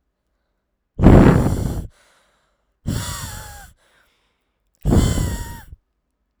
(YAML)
exhalation_length: 6.4 s
exhalation_amplitude: 32768
exhalation_signal_mean_std_ratio: 0.37
survey_phase: beta (2021-08-13 to 2022-03-07)
age: 18-44
gender: Female
wearing_mask: 'No'
symptom_cough_any: true
symptom_runny_or_blocked_nose: true
symptom_fatigue: true
symptom_onset: 9 days
smoker_status: Never smoked
respiratory_condition_asthma: true
respiratory_condition_other: false
recruitment_source: REACT
submission_delay: 4 days
covid_test_result: Negative
covid_test_method: RT-qPCR
influenza_a_test_result: Unknown/Void
influenza_b_test_result: Unknown/Void